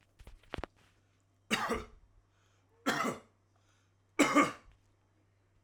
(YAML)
three_cough_length: 5.6 s
three_cough_amplitude: 7916
three_cough_signal_mean_std_ratio: 0.31
survey_phase: alpha (2021-03-01 to 2021-08-12)
age: 45-64
gender: Male
wearing_mask: 'No'
symptom_none: true
smoker_status: Ex-smoker
respiratory_condition_asthma: false
respiratory_condition_other: false
recruitment_source: REACT
submission_delay: 2 days
covid_test_result: Negative
covid_test_method: RT-qPCR